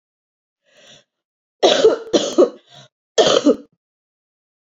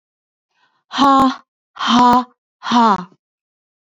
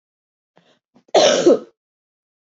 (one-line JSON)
{"three_cough_length": "4.6 s", "three_cough_amplitude": 32768, "three_cough_signal_mean_std_ratio": 0.36, "exhalation_length": "3.9 s", "exhalation_amplitude": 28465, "exhalation_signal_mean_std_ratio": 0.44, "cough_length": "2.6 s", "cough_amplitude": 28485, "cough_signal_mean_std_ratio": 0.33, "survey_phase": "beta (2021-08-13 to 2022-03-07)", "age": "18-44", "gender": "Female", "wearing_mask": "No", "symptom_cough_any": true, "symptom_runny_or_blocked_nose": true, "symptom_sore_throat": true, "symptom_fatigue": true, "symptom_fever_high_temperature": true, "symptom_headache": true, "symptom_change_to_sense_of_smell_or_taste": true, "symptom_onset": "4 days", "smoker_status": "Never smoked", "respiratory_condition_asthma": false, "respiratory_condition_other": false, "recruitment_source": "Test and Trace", "submission_delay": "1 day", "covid_test_result": "Positive", "covid_test_method": "RT-qPCR", "covid_ct_value": 16.1, "covid_ct_gene": "N gene", "covid_ct_mean": 16.2, "covid_viral_load": "4900000 copies/ml", "covid_viral_load_category": "High viral load (>1M copies/ml)"}